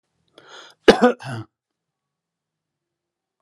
{"cough_length": "3.4 s", "cough_amplitude": 32768, "cough_signal_mean_std_ratio": 0.2, "survey_phase": "alpha (2021-03-01 to 2021-08-12)", "age": "45-64", "gender": "Male", "wearing_mask": "No", "symptom_none": true, "smoker_status": "Ex-smoker", "respiratory_condition_asthma": false, "respiratory_condition_other": false, "recruitment_source": "REACT", "submission_delay": "1 day", "covid_test_result": "Negative", "covid_test_method": "RT-qPCR"}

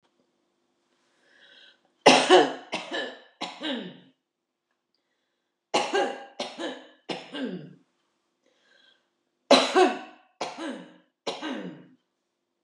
{"three_cough_length": "12.6 s", "three_cough_amplitude": 27582, "three_cough_signal_mean_std_ratio": 0.31, "survey_phase": "beta (2021-08-13 to 2022-03-07)", "age": "65+", "gender": "Female", "wearing_mask": "No", "symptom_abdominal_pain": true, "symptom_fatigue": true, "symptom_change_to_sense_of_smell_or_taste": true, "symptom_loss_of_taste": true, "smoker_status": "Ex-smoker", "respiratory_condition_asthma": false, "respiratory_condition_other": false, "recruitment_source": "REACT", "submission_delay": "2 days", "covid_test_result": "Negative", "covid_test_method": "RT-qPCR", "influenza_a_test_result": "Unknown/Void", "influenza_b_test_result": "Unknown/Void"}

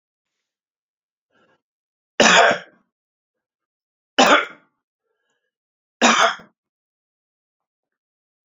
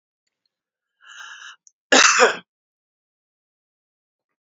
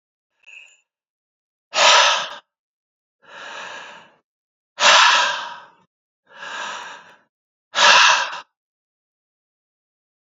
{"three_cough_length": "8.4 s", "three_cough_amplitude": 32458, "three_cough_signal_mean_std_ratio": 0.26, "cough_length": "4.4 s", "cough_amplitude": 32767, "cough_signal_mean_std_ratio": 0.25, "exhalation_length": "10.3 s", "exhalation_amplitude": 31007, "exhalation_signal_mean_std_ratio": 0.35, "survey_phase": "beta (2021-08-13 to 2022-03-07)", "age": "45-64", "gender": "Male", "wearing_mask": "No", "symptom_cough_any": true, "symptom_runny_or_blocked_nose": true, "symptom_fatigue": true, "symptom_fever_high_temperature": true, "symptom_headache": true, "symptom_change_to_sense_of_smell_or_taste": true, "symptom_loss_of_taste": true, "symptom_onset": "4 days", "smoker_status": "Never smoked", "respiratory_condition_asthma": false, "respiratory_condition_other": false, "recruitment_source": "Test and Trace", "submission_delay": "1 day", "covid_test_result": "Positive", "covid_test_method": "RT-qPCR", "covid_ct_value": 13.2, "covid_ct_gene": "ORF1ab gene", "covid_ct_mean": 13.9, "covid_viral_load": "27000000 copies/ml", "covid_viral_load_category": "High viral load (>1M copies/ml)"}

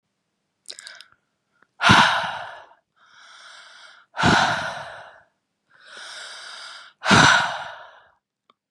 {"exhalation_length": "8.7 s", "exhalation_amplitude": 31842, "exhalation_signal_mean_std_ratio": 0.36, "survey_phase": "beta (2021-08-13 to 2022-03-07)", "age": "18-44", "gender": "Female", "wearing_mask": "No", "symptom_none": true, "smoker_status": "Never smoked", "respiratory_condition_asthma": false, "respiratory_condition_other": false, "recruitment_source": "REACT", "submission_delay": "2 days", "covid_test_result": "Negative", "covid_test_method": "RT-qPCR", "influenza_a_test_result": "Negative", "influenza_b_test_result": "Negative"}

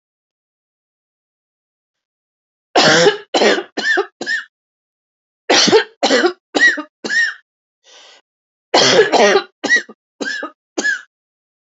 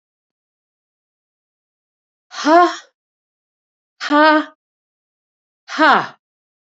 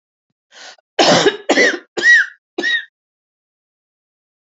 {"three_cough_length": "11.8 s", "three_cough_amplitude": 32768, "three_cough_signal_mean_std_ratio": 0.44, "exhalation_length": "6.7 s", "exhalation_amplitude": 28504, "exhalation_signal_mean_std_ratio": 0.3, "cough_length": "4.4 s", "cough_amplitude": 32208, "cough_signal_mean_std_ratio": 0.41, "survey_phase": "alpha (2021-03-01 to 2021-08-12)", "age": "65+", "gender": "Female", "wearing_mask": "No", "symptom_cough_any": true, "symptom_onset": "5 days", "smoker_status": "Never smoked", "respiratory_condition_asthma": false, "respiratory_condition_other": false, "recruitment_source": "Test and Trace", "submission_delay": "1 day", "covid_test_result": "Positive", "covid_test_method": "RT-qPCR", "covid_ct_value": 25.8, "covid_ct_gene": "ORF1ab gene", "covid_ct_mean": 26.3, "covid_viral_load": "2400 copies/ml", "covid_viral_load_category": "Minimal viral load (< 10K copies/ml)"}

